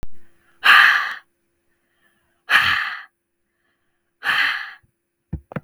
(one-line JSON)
{"exhalation_length": "5.6 s", "exhalation_amplitude": 32768, "exhalation_signal_mean_std_ratio": 0.39, "survey_phase": "beta (2021-08-13 to 2022-03-07)", "age": "45-64", "gender": "Female", "wearing_mask": "No", "symptom_none": true, "smoker_status": "Never smoked", "respiratory_condition_asthma": false, "respiratory_condition_other": false, "recruitment_source": "REACT", "submission_delay": "3 days", "covid_test_result": "Negative", "covid_test_method": "RT-qPCR", "influenza_a_test_result": "Negative", "influenza_b_test_result": "Negative"}